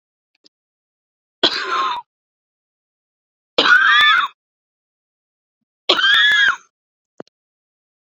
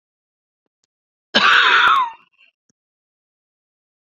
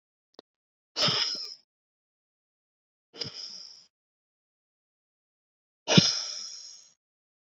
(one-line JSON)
{"three_cough_length": "8.0 s", "three_cough_amplitude": 29886, "three_cough_signal_mean_std_ratio": 0.39, "cough_length": "4.1 s", "cough_amplitude": 28520, "cough_signal_mean_std_ratio": 0.36, "exhalation_length": "7.6 s", "exhalation_amplitude": 22381, "exhalation_signal_mean_std_ratio": 0.27, "survey_phase": "beta (2021-08-13 to 2022-03-07)", "age": "65+", "gender": "Female", "wearing_mask": "No", "symptom_cough_any": true, "symptom_shortness_of_breath": true, "symptom_sore_throat": true, "symptom_abdominal_pain": true, "symptom_fatigue": true, "symptom_headache": true, "symptom_onset": "10 days", "smoker_status": "Never smoked", "respiratory_condition_asthma": true, "respiratory_condition_other": false, "recruitment_source": "REACT", "submission_delay": "2 days", "covid_test_result": "Negative", "covid_test_method": "RT-qPCR"}